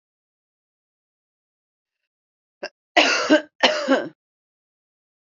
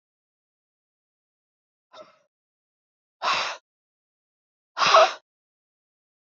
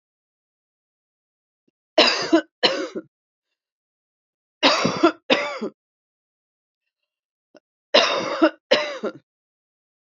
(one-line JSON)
{"cough_length": "5.3 s", "cough_amplitude": 28584, "cough_signal_mean_std_ratio": 0.29, "exhalation_length": "6.2 s", "exhalation_amplitude": 20637, "exhalation_signal_mean_std_ratio": 0.22, "three_cough_length": "10.2 s", "three_cough_amplitude": 29271, "three_cough_signal_mean_std_ratio": 0.34, "survey_phase": "beta (2021-08-13 to 2022-03-07)", "age": "45-64", "gender": "Female", "wearing_mask": "No", "symptom_none": true, "smoker_status": "Never smoked", "respiratory_condition_asthma": false, "respiratory_condition_other": false, "recruitment_source": "REACT", "submission_delay": "6 days", "covid_test_result": "Negative", "covid_test_method": "RT-qPCR", "influenza_a_test_result": "Negative", "influenza_b_test_result": "Negative"}